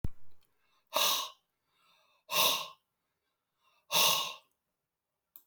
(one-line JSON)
{"exhalation_length": "5.5 s", "exhalation_amplitude": 7002, "exhalation_signal_mean_std_ratio": 0.39, "survey_phase": "beta (2021-08-13 to 2022-03-07)", "age": "45-64", "gender": "Male", "wearing_mask": "No", "symptom_none": true, "smoker_status": "Current smoker (11 or more cigarettes per day)", "respiratory_condition_asthma": false, "respiratory_condition_other": false, "recruitment_source": "REACT", "submission_delay": "1 day", "covid_test_result": "Negative", "covid_test_method": "RT-qPCR"}